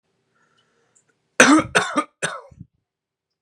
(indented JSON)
{
  "three_cough_length": "3.4 s",
  "three_cough_amplitude": 32767,
  "three_cough_signal_mean_std_ratio": 0.3,
  "survey_phase": "beta (2021-08-13 to 2022-03-07)",
  "age": "18-44",
  "gender": "Male",
  "wearing_mask": "No",
  "symptom_cough_any": true,
  "symptom_runny_or_blocked_nose": true,
  "symptom_sore_throat": true,
  "symptom_diarrhoea": true,
  "symptom_fatigue": true,
  "symptom_onset": "3 days",
  "smoker_status": "Never smoked",
  "respiratory_condition_asthma": false,
  "respiratory_condition_other": false,
  "recruitment_source": "Test and Trace",
  "submission_delay": "1 day",
  "covid_test_result": "Negative",
  "covid_test_method": "RT-qPCR"
}